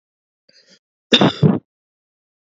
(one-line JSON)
{"cough_length": "2.6 s", "cough_amplitude": 30928, "cough_signal_mean_std_ratio": 0.29, "survey_phase": "beta (2021-08-13 to 2022-03-07)", "age": "18-44", "gender": "Female", "wearing_mask": "No", "symptom_cough_any": true, "symptom_runny_or_blocked_nose": true, "symptom_sore_throat": true, "symptom_headache": true, "symptom_onset": "2 days", "smoker_status": "Ex-smoker", "respiratory_condition_asthma": false, "respiratory_condition_other": false, "recruitment_source": "Test and Trace", "submission_delay": "2 days", "covid_test_result": "Positive", "covid_test_method": "RT-qPCR", "covid_ct_value": 18.2, "covid_ct_gene": "ORF1ab gene", "covid_ct_mean": 18.4, "covid_viral_load": "940000 copies/ml", "covid_viral_load_category": "Low viral load (10K-1M copies/ml)"}